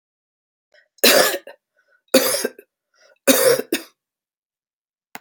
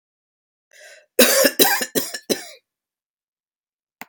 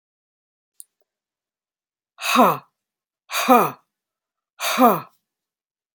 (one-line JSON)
{"three_cough_length": "5.2 s", "three_cough_amplitude": 32768, "three_cough_signal_mean_std_ratio": 0.34, "cough_length": "4.1 s", "cough_amplitude": 32768, "cough_signal_mean_std_ratio": 0.34, "exhalation_length": "5.9 s", "exhalation_amplitude": 29492, "exhalation_signal_mean_std_ratio": 0.3, "survey_phase": "alpha (2021-03-01 to 2021-08-12)", "age": "45-64", "gender": "Female", "wearing_mask": "No", "symptom_none": true, "smoker_status": "Ex-smoker", "respiratory_condition_asthma": false, "respiratory_condition_other": false, "recruitment_source": "REACT", "submission_delay": "1 day", "covid_test_result": "Negative", "covid_test_method": "RT-qPCR"}